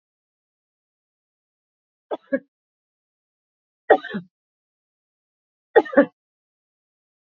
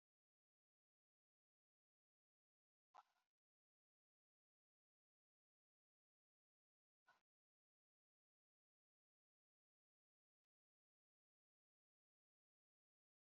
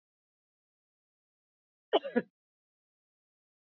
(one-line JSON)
{"three_cough_length": "7.3 s", "three_cough_amplitude": 31335, "three_cough_signal_mean_std_ratio": 0.16, "exhalation_length": "13.3 s", "exhalation_amplitude": 81, "exhalation_signal_mean_std_ratio": 0.07, "cough_length": "3.7 s", "cough_amplitude": 6668, "cough_signal_mean_std_ratio": 0.15, "survey_phase": "beta (2021-08-13 to 2022-03-07)", "age": "45-64", "gender": "Female", "wearing_mask": "No", "symptom_cough_any": true, "symptom_runny_or_blocked_nose": true, "symptom_sore_throat": true, "symptom_fatigue": true, "symptom_headache": true, "symptom_change_to_sense_of_smell_or_taste": true, "symptom_loss_of_taste": true, "symptom_onset": "3 days", "smoker_status": "Never smoked", "respiratory_condition_asthma": false, "respiratory_condition_other": false, "recruitment_source": "Test and Trace", "submission_delay": "2 days", "covid_test_result": "Positive", "covid_test_method": "RT-qPCR", "covid_ct_value": 18.9, "covid_ct_gene": "ORF1ab gene", "covid_ct_mean": 19.8, "covid_viral_load": "310000 copies/ml", "covid_viral_load_category": "Low viral load (10K-1M copies/ml)"}